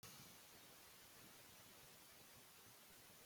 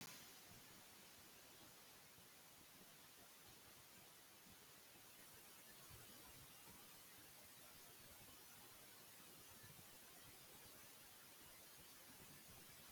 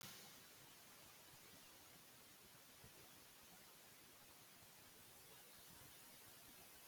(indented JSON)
{
  "cough_length": "3.3 s",
  "cough_amplitude": 156,
  "cough_signal_mean_std_ratio": 1.22,
  "exhalation_length": "12.9 s",
  "exhalation_amplitude": 229,
  "exhalation_signal_mean_std_ratio": 1.23,
  "three_cough_length": "6.9 s",
  "three_cough_amplitude": 182,
  "three_cough_signal_mean_std_ratio": 1.2,
  "survey_phase": "alpha (2021-03-01 to 2021-08-12)",
  "age": "45-64",
  "gender": "Female",
  "wearing_mask": "No",
  "symptom_none": true,
  "smoker_status": "Never smoked",
  "respiratory_condition_asthma": false,
  "respiratory_condition_other": false,
  "recruitment_source": "REACT",
  "submission_delay": "2 days",
  "covid_test_result": "Negative",
  "covid_test_method": "RT-qPCR"
}